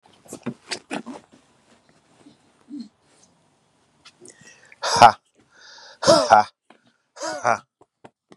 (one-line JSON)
{"exhalation_length": "8.4 s", "exhalation_amplitude": 32768, "exhalation_signal_mean_std_ratio": 0.24, "survey_phase": "beta (2021-08-13 to 2022-03-07)", "age": "45-64", "gender": "Male", "wearing_mask": "No", "symptom_none": true, "smoker_status": "Ex-smoker", "respiratory_condition_asthma": false, "respiratory_condition_other": false, "recruitment_source": "REACT", "submission_delay": "1 day", "covid_test_result": "Negative", "covid_test_method": "RT-qPCR", "influenza_a_test_result": "Negative", "influenza_b_test_result": "Negative"}